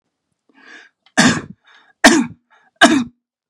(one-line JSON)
{"three_cough_length": "3.5 s", "three_cough_amplitude": 32768, "three_cough_signal_mean_std_ratio": 0.35, "survey_phase": "beta (2021-08-13 to 2022-03-07)", "age": "45-64", "gender": "Male", "wearing_mask": "No", "symptom_none": true, "smoker_status": "Never smoked", "respiratory_condition_asthma": true, "respiratory_condition_other": false, "recruitment_source": "REACT", "submission_delay": "1 day", "covid_test_result": "Negative", "covid_test_method": "RT-qPCR", "influenza_a_test_result": "Negative", "influenza_b_test_result": "Negative"}